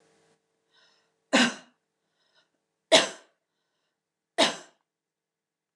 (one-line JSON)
{"three_cough_length": "5.8 s", "three_cough_amplitude": 21166, "three_cough_signal_mean_std_ratio": 0.22, "survey_phase": "beta (2021-08-13 to 2022-03-07)", "age": "45-64", "gender": "Female", "wearing_mask": "No", "symptom_none": true, "smoker_status": "Never smoked", "respiratory_condition_asthma": false, "respiratory_condition_other": false, "recruitment_source": "REACT", "submission_delay": "1 day", "covid_test_result": "Negative", "covid_test_method": "RT-qPCR"}